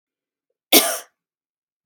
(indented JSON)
{
  "cough_length": "1.9 s",
  "cough_amplitude": 32768,
  "cough_signal_mean_std_ratio": 0.24,
  "survey_phase": "beta (2021-08-13 to 2022-03-07)",
  "age": "45-64",
  "gender": "Female",
  "wearing_mask": "No",
  "symptom_none": true,
  "smoker_status": "Never smoked",
  "respiratory_condition_asthma": false,
  "respiratory_condition_other": false,
  "recruitment_source": "REACT",
  "submission_delay": "1 day",
  "covid_test_result": "Negative",
  "covid_test_method": "RT-qPCR",
  "influenza_a_test_result": "Negative",
  "influenza_b_test_result": "Negative"
}